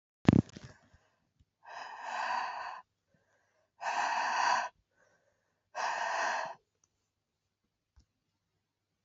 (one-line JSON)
{"exhalation_length": "9.0 s", "exhalation_amplitude": 14573, "exhalation_signal_mean_std_ratio": 0.37, "survey_phase": "beta (2021-08-13 to 2022-03-07)", "age": "45-64", "gender": "Female", "wearing_mask": "No", "symptom_cough_any": true, "symptom_runny_or_blocked_nose": true, "symptom_shortness_of_breath": true, "symptom_sore_throat": true, "symptom_fatigue": true, "symptom_headache": true, "smoker_status": "Never smoked", "respiratory_condition_asthma": false, "respiratory_condition_other": false, "recruitment_source": "Test and Trace", "submission_delay": "2 days", "covid_test_result": "Positive", "covid_test_method": "RT-qPCR", "covid_ct_value": 27.9, "covid_ct_gene": "ORF1ab gene"}